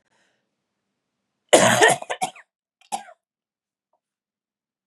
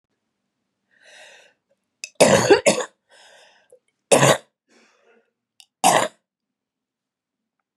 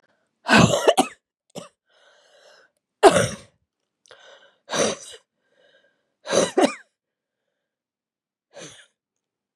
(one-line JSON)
{"cough_length": "4.9 s", "cough_amplitude": 31937, "cough_signal_mean_std_ratio": 0.26, "three_cough_length": "7.8 s", "three_cough_amplitude": 32388, "three_cough_signal_mean_std_ratio": 0.28, "exhalation_length": "9.6 s", "exhalation_amplitude": 32767, "exhalation_signal_mean_std_ratio": 0.28, "survey_phase": "beta (2021-08-13 to 2022-03-07)", "age": "45-64", "gender": "Female", "wearing_mask": "No", "symptom_cough_any": true, "symptom_runny_or_blocked_nose": true, "symptom_fatigue": true, "symptom_headache": true, "symptom_change_to_sense_of_smell_or_taste": true, "smoker_status": "Never smoked", "respiratory_condition_asthma": false, "respiratory_condition_other": false, "recruitment_source": "Test and Trace", "submission_delay": "1 day", "covid_test_result": "Positive", "covid_test_method": "RT-qPCR", "covid_ct_value": 21.0, "covid_ct_gene": "ORF1ab gene", "covid_ct_mean": 21.6, "covid_viral_load": "84000 copies/ml", "covid_viral_load_category": "Low viral load (10K-1M copies/ml)"}